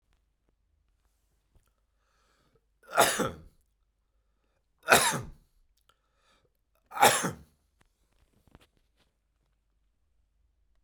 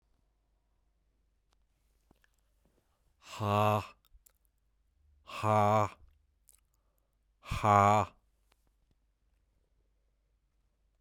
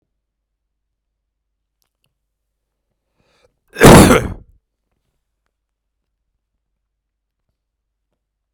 three_cough_length: 10.8 s
three_cough_amplitude: 23287
three_cough_signal_mean_std_ratio: 0.22
exhalation_length: 11.0 s
exhalation_amplitude: 10283
exhalation_signal_mean_std_ratio: 0.3
cough_length: 8.5 s
cough_amplitude: 32768
cough_signal_mean_std_ratio: 0.19
survey_phase: beta (2021-08-13 to 2022-03-07)
age: 45-64
gender: Male
wearing_mask: 'No'
symptom_none: true
smoker_status: Ex-smoker
respiratory_condition_asthma: false
respiratory_condition_other: false
recruitment_source: REACT
submission_delay: 1 day
covid_test_result: Negative
covid_test_method: RT-qPCR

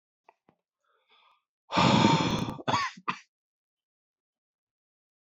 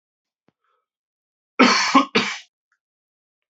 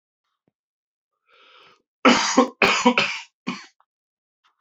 exhalation_length: 5.4 s
exhalation_amplitude: 12271
exhalation_signal_mean_std_ratio: 0.35
cough_length: 3.5 s
cough_amplitude: 27603
cough_signal_mean_std_ratio: 0.31
three_cough_length: 4.6 s
three_cough_amplitude: 30266
three_cough_signal_mean_std_ratio: 0.34
survey_phase: beta (2021-08-13 to 2022-03-07)
age: 18-44
gender: Male
wearing_mask: 'No'
symptom_cough_any: true
symptom_runny_or_blocked_nose: true
symptom_fatigue: true
symptom_onset: 2 days
smoker_status: Never smoked
respiratory_condition_asthma: false
respiratory_condition_other: false
recruitment_source: Test and Trace
submission_delay: 1 day
covid_test_result: Positive
covid_test_method: RT-qPCR
covid_ct_value: 17.8
covid_ct_gene: ORF1ab gene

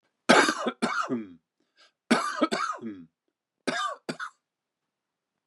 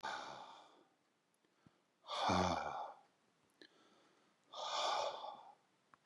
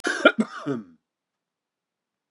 three_cough_length: 5.5 s
three_cough_amplitude: 22067
three_cough_signal_mean_std_ratio: 0.4
exhalation_length: 6.1 s
exhalation_amplitude: 2087
exhalation_signal_mean_std_ratio: 0.47
cough_length: 2.3 s
cough_amplitude: 26523
cough_signal_mean_std_ratio: 0.29
survey_phase: beta (2021-08-13 to 2022-03-07)
age: 45-64
gender: Male
wearing_mask: 'No'
symptom_cough_any: true
symptom_fatigue: true
symptom_headache: true
symptom_onset: 9 days
smoker_status: Never smoked
respiratory_condition_asthma: false
respiratory_condition_other: false
recruitment_source: Test and Trace
submission_delay: 1 day
covid_test_result: Positive
covid_test_method: RT-qPCR
covid_ct_value: 23.3
covid_ct_gene: N gene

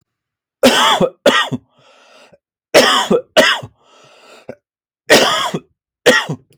cough_length: 6.6 s
cough_amplitude: 32768
cough_signal_mean_std_ratio: 0.46
survey_phase: alpha (2021-03-01 to 2021-08-12)
age: 45-64
gender: Male
wearing_mask: 'No'
symptom_none: true
smoker_status: Never smoked
respiratory_condition_asthma: false
respiratory_condition_other: false
recruitment_source: REACT
submission_delay: 3 days
covid_test_result: Negative
covid_test_method: RT-qPCR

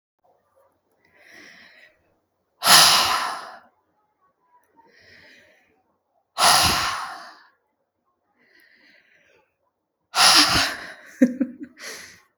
exhalation_length: 12.4 s
exhalation_amplitude: 32768
exhalation_signal_mean_std_ratio: 0.33
survey_phase: beta (2021-08-13 to 2022-03-07)
age: 18-44
gender: Female
wearing_mask: 'No'
symptom_none: true
smoker_status: Never smoked
respiratory_condition_asthma: false
respiratory_condition_other: false
recruitment_source: REACT
submission_delay: 2 days
covid_test_result: Negative
covid_test_method: RT-qPCR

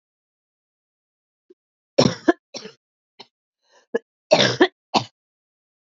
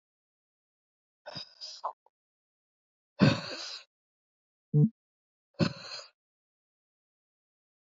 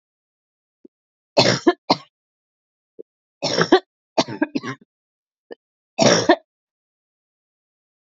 cough_length: 5.8 s
cough_amplitude: 28588
cough_signal_mean_std_ratio: 0.24
exhalation_length: 7.9 s
exhalation_amplitude: 11060
exhalation_signal_mean_std_ratio: 0.23
three_cough_length: 8.0 s
three_cough_amplitude: 32244
three_cough_signal_mean_std_ratio: 0.28
survey_phase: beta (2021-08-13 to 2022-03-07)
age: 45-64
gender: Female
wearing_mask: 'No'
symptom_cough_any: true
symptom_runny_or_blocked_nose: true
symptom_abdominal_pain: true
symptom_diarrhoea: true
symptom_fatigue: true
symptom_fever_high_temperature: true
symptom_change_to_sense_of_smell_or_taste: true
symptom_onset: 3 days
smoker_status: Never smoked
respiratory_condition_asthma: false
respiratory_condition_other: false
recruitment_source: Test and Trace
submission_delay: 2 days
covid_test_result: Positive
covid_test_method: RT-qPCR
covid_ct_value: 19.8
covid_ct_gene: ORF1ab gene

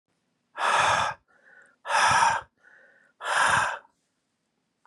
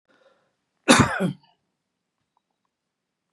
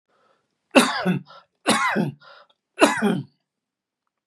exhalation_length: 4.9 s
exhalation_amplitude: 12486
exhalation_signal_mean_std_ratio: 0.49
cough_length: 3.3 s
cough_amplitude: 32605
cough_signal_mean_std_ratio: 0.24
three_cough_length: 4.3 s
three_cough_amplitude: 32594
three_cough_signal_mean_std_ratio: 0.4
survey_phase: beta (2021-08-13 to 2022-03-07)
age: 65+
gender: Male
wearing_mask: 'No'
symptom_cough_any: true
smoker_status: Never smoked
respiratory_condition_asthma: false
respiratory_condition_other: false
recruitment_source: REACT
submission_delay: 2 days
covid_test_result: Negative
covid_test_method: RT-qPCR
influenza_a_test_result: Negative
influenza_b_test_result: Negative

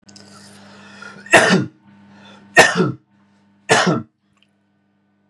three_cough_length: 5.3 s
three_cough_amplitude: 32768
three_cough_signal_mean_std_ratio: 0.35
survey_phase: beta (2021-08-13 to 2022-03-07)
age: 18-44
gender: Male
wearing_mask: 'No'
symptom_none: true
smoker_status: Ex-smoker
respiratory_condition_asthma: false
respiratory_condition_other: false
recruitment_source: REACT
submission_delay: 2 days
covid_test_result: Negative
covid_test_method: RT-qPCR
influenza_a_test_result: Negative
influenza_b_test_result: Negative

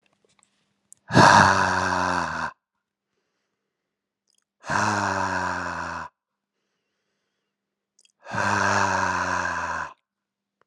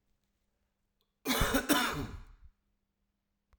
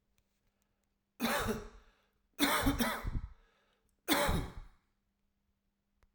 exhalation_length: 10.7 s
exhalation_amplitude: 30200
exhalation_signal_mean_std_ratio: 0.45
cough_length: 3.6 s
cough_amplitude: 8971
cough_signal_mean_std_ratio: 0.38
three_cough_length: 6.1 s
three_cough_amplitude: 5832
three_cough_signal_mean_std_ratio: 0.43
survey_phase: alpha (2021-03-01 to 2021-08-12)
age: 45-64
gender: Male
wearing_mask: 'No'
symptom_headache: true
symptom_change_to_sense_of_smell_or_taste: true
symptom_onset: 2 days
smoker_status: Never smoked
respiratory_condition_asthma: false
respiratory_condition_other: false
recruitment_source: Test and Trace
submission_delay: 2 days
covid_test_result: Positive
covid_test_method: RT-qPCR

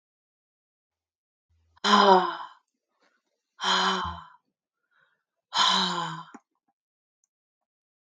exhalation_length: 8.2 s
exhalation_amplitude: 17742
exhalation_signal_mean_std_ratio: 0.33
survey_phase: beta (2021-08-13 to 2022-03-07)
age: 65+
gender: Female
wearing_mask: 'No'
symptom_none: true
smoker_status: Never smoked
respiratory_condition_asthma: false
respiratory_condition_other: false
recruitment_source: REACT
submission_delay: 1 day
covid_test_result: Negative
covid_test_method: RT-qPCR
influenza_a_test_result: Negative
influenza_b_test_result: Negative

